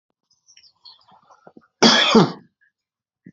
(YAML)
cough_length: 3.3 s
cough_amplitude: 28959
cough_signal_mean_std_ratio: 0.3
survey_phase: alpha (2021-03-01 to 2021-08-12)
age: 45-64
gender: Male
wearing_mask: 'No'
symptom_none: true
smoker_status: Ex-smoker
respiratory_condition_asthma: false
respiratory_condition_other: false
recruitment_source: REACT
submission_delay: 2 days
covid_test_result: Negative
covid_test_method: RT-qPCR